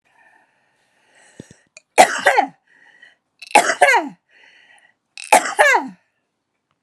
{"three_cough_length": "6.8 s", "three_cough_amplitude": 32768, "three_cough_signal_mean_std_ratio": 0.32, "survey_phase": "alpha (2021-03-01 to 2021-08-12)", "age": "65+", "gender": "Female", "wearing_mask": "No", "symptom_shortness_of_breath": true, "smoker_status": "Never smoked", "respiratory_condition_asthma": true, "respiratory_condition_other": false, "recruitment_source": "REACT", "submission_delay": "20 days", "covid_test_result": "Negative", "covid_test_method": "RT-qPCR"}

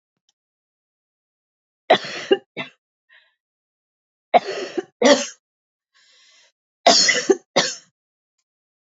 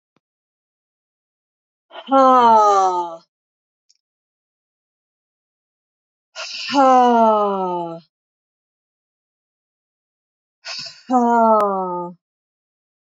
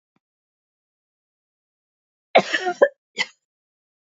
{"three_cough_length": "8.9 s", "three_cough_amplitude": 27945, "three_cough_signal_mean_std_ratio": 0.28, "exhalation_length": "13.1 s", "exhalation_amplitude": 27038, "exhalation_signal_mean_std_ratio": 0.39, "cough_length": "4.1 s", "cough_amplitude": 26429, "cough_signal_mean_std_ratio": 0.21, "survey_phase": "beta (2021-08-13 to 2022-03-07)", "age": "45-64", "gender": "Female", "wearing_mask": "No", "symptom_none": true, "smoker_status": "Ex-smoker", "respiratory_condition_asthma": false, "respiratory_condition_other": false, "recruitment_source": "REACT", "submission_delay": "2 days", "covid_test_result": "Negative", "covid_test_method": "RT-qPCR", "influenza_a_test_result": "Negative", "influenza_b_test_result": "Negative"}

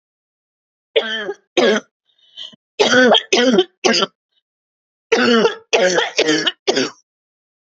{"three_cough_length": "7.8 s", "three_cough_amplitude": 32767, "three_cough_signal_mean_std_ratio": 0.5, "survey_phase": "beta (2021-08-13 to 2022-03-07)", "age": "45-64", "gender": "Female", "wearing_mask": "No", "symptom_cough_any": true, "symptom_runny_or_blocked_nose": true, "symptom_sore_throat": true, "symptom_fatigue": true, "symptom_fever_high_temperature": true, "symptom_headache": true, "symptom_loss_of_taste": true, "symptom_other": true, "symptom_onset": "5 days", "smoker_status": "Never smoked", "respiratory_condition_asthma": false, "respiratory_condition_other": true, "recruitment_source": "Test and Trace", "submission_delay": "2 days", "covid_test_result": "Positive", "covid_test_method": "RT-qPCR", "covid_ct_value": 18.8, "covid_ct_gene": "ORF1ab gene", "covid_ct_mean": 19.3, "covid_viral_load": "470000 copies/ml", "covid_viral_load_category": "Low viral load (10K-1M copies/ml)"}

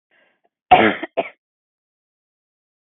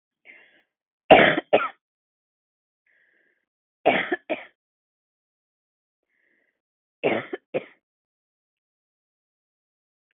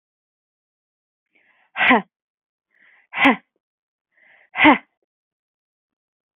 {"cough_length": "3.0 s", "cough_amplitude": 32768, "cough_signal_mean_std_ratio": 0.23, "three_cough_length": "10.2 s", "three_cough_amplitude": 32766, "three_cough_signal_mean_std_ratio": 0.21, "exhalation_length": "6.4 s", "exhalation_amplitude": 32613, "exhalation_signal_mean_std_ratio": 0.24, "survey_phase": "beta (2021-08-13 to 2022-03-07)", "age": "45-64", "gender": "Female", "wearing_mask": "No", "symptom_cough_any": true, "smoker_status": "Never smoked", "respiratory_condition_asthma": false, "respiratory_condition_other": false, "recruitment_source": "Test and Trace", "submission_delay": "1 day", "covid_test_result": "Negative", "covid_test_method": "LFT"}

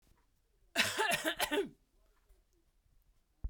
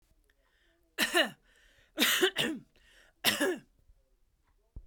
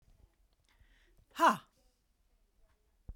{"cough_length": "3.5 s", "cough_amplitude": 5249, "cough_signal_mean_std_ratio": 0.4, "three_cough_length": "4.9 s", "three_cough_amplitude": 11412, "three_cough_signal_mean_std_ratio": 0.39, "exhalation_length": "3.2 s", "exhalation_amplitude": 7101, "exhalation_signal_mean_std_ratio": 0.2, "survey_phase": "beta (2021-08-13 to 2022-03-07)", "age": "45-64", "gender": "Female", "wearing_mask": "No", "symptom_none": true, "symptom_onset": "12 days", "smoker_status": "Never smoked", "respiratory_condition_asthma": false, "respiratory_condition_other": false, "recruitment_source": "REACT", "submission_delay": "3 days", "covid_test_result": "Negative", "covid_test_method": "RT-qPCR"}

